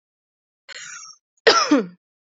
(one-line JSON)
{"cough_length": "2.4 s", "cough_amplitude": 28767, "cough_signal_mean_std_ratio": 0.33, "survey_phase": "beta (2021-08-13 to 2022-03-07)", "age": "18-44", "gender": "Female", "wearing_mask": "No", "symptom_fatigue": true, "symptom_headache": true, "symptom_other": true, "smoker_status": "Never smoked", "respiratory_condition_asthma": true, "respiratory_condition_other": false, "recruitment_source": "REACT", "submission_delay": "1 day", "covid_test_result": "Negative", "covid_test_method": "RT-qPCR", "covid_ct_value": 38.0, "covid_ct_gene": "N gene", "influenza_a_test_result": "Negative", "influenza_b_test_result": "Negative"}